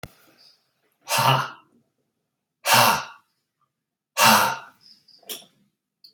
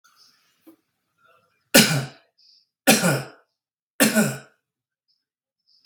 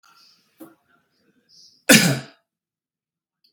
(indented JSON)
{
  "exhalation_length": "6.1 s",
  "exhalation_amplitude": 26732,
  "exhalation_signal_mean_std_ratio": 0.35,
  "three_cough_length": "5.9 s",
  "three_cough_amplitude": 32767,
  "three_cough_signal_mean_std_ratio": 0.3,
  "cough_length": "3.5 s",
  "cough_amplitude": 32767,
  "cough_signal_mean_std_ratio": 0.22,
  "survey_phase": "beta (2021-08-13 to 2022-03-07)",
  "age": "45-64",
  "gender": "Male",
  "wearing_mask": "No",
  "symptom_none": true,
  "smoker_status": "Never smoked",
  "respiratory_condition_asthma": false,
  "respiratory_condition_other": false,
  "recruitment_source": "REACT",
  "submission_delay": "1 day",
  "covid_test_result": "Negative",
  "covid_test_method": "RT-qPCR",
  "influenza_a_test_result": "Negative",
  "influenza_b_test_result": "Negative"
}